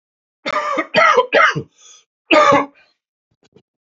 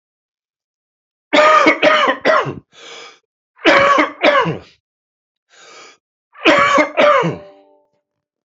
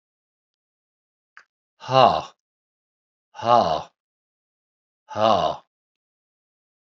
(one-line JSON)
{"cough_length": "3.8 s", "cough_amplitude": 28304, "cough_signal_mean_std_ratio": 0.46, "three_cough_length": "8.4 s", "three_cough_amplitude": 32767, "three_cough_signal_mean_std_ratio": 0.48, "exhalation_length": "6.8 s", "exhalation_amplitude": 26795, "exhalation_signal_mean_std_ratio": 0.28, "survey_phase": "beta (2021-08-13 to 2022-03-07)", "age": "45-64", "gender": "Male", "wearing_mask": "No", "symptom_cough_any": true, "symptom_sore_throat": true, "symptom_headache": true, "symptom_onset": "3 days", "smoker_status": "Current smoker (1 to 10 cigarettes per day)", "respiratory_condition_asthma": false, "respiratory_condition_other": true, "recruitment_source": "Test and Trace", "submission_delay": "1 day", "covid_test_result": "Positive", "covid_test_method": "RT-qPCR", "covid_ct_value": 17.9, "covid_ct_gene": "N gene"}